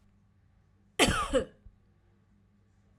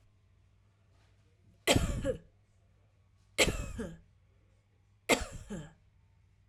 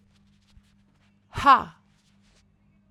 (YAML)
cough_length: 3.0 s
cough_amplitude: 10338
cough_signal_mean_std_ratio: 0.31
three_cough_length: 6.5 s
three_cough_amplitude: 11515
three_cough_signal_mean_std_ratio: 0.32
exhalation_length: 2.9 s
exhalation_amplitude: 22421
exhalation_signal_mean_std_ratio: 0.21
survey_phase: alpha (2021-03-01 to 2021-08-12)
age: 18-44
gender: Female
wearing_mask: 'No'
symptom_none: true
smoker_status: Never smoked
respiratory_condition_asthma: false
respiratory_condition_other: false
recruitment_source: REACT
submission_delay: 2 days
covid_test_result: Negative
covid_test_method: RT-qPCR